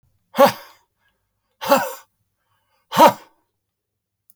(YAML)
exhalation_length: 4.4 s
exhalation_amplitude: 29451
exhalation_signal_mean_std_ratio: 0.26
survey_phase: beta (2021-08-13 to 2022-03-07)
age: 65+
gender: Male
wearing_mask: 'No'
symptom_none: true
smoker_status: Never smoked
respiratory_condition_asthma: false
respiratory_condition_other: false
recruitment_source: REACT
submission_delay: 1 day
covid_test_result: Negative
covid_test_method: RT-qPCR